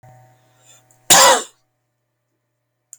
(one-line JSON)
{"cough_length": "3.0 s", "cough_amplitude": 32768, "cough_signal_mean_std_ratio": 0.28, "survey_phase": "beta (2021-08-13 to 2022-03-07)", "age": "45-64", "gender": "Male", "wearing_mask": "No", "symptom_runny_or_blocked_nose": true, "smoker_status": "Never smoked", "respiratory_condition_asthma": false, "respiratory_condition_other": false, "recruitment_source": "REACT", "submission_delay": "1 day", "covid_test_result": "Negative", "covid_test_method": "RT-qPCR"}